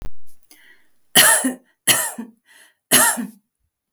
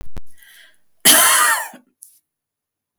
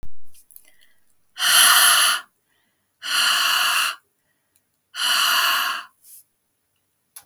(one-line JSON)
{"three_cough_length": "3.9 s", "three_cough_amplitude": 32768, "three_cough_signal_mean_std_ratio": 0.45, "cough_length": "3.0 s", "cough_amplitude": 32768, "cough_signal_mean_std_ratio": 0.44, "exhalation_length": "7.3 s", "exhalation_amplitude": 28009, "exhalation_signal_mean_std_ratio": 0.54, "survey_phase": "beta (2021-08-13 to 2022-03-07)", "age": "45-64", "gender": "Female", "wearing_mask": "No", "symptom_none": true, "smoker_status": "Never smoked", "respiratory_condition_asthma": false, "respiratory_condition_other": false, "recruitment_source": "REACT", "submission_delay": "1 day", "covid_test_result": "Negative", "covid_test_method": "RT-qPCR"}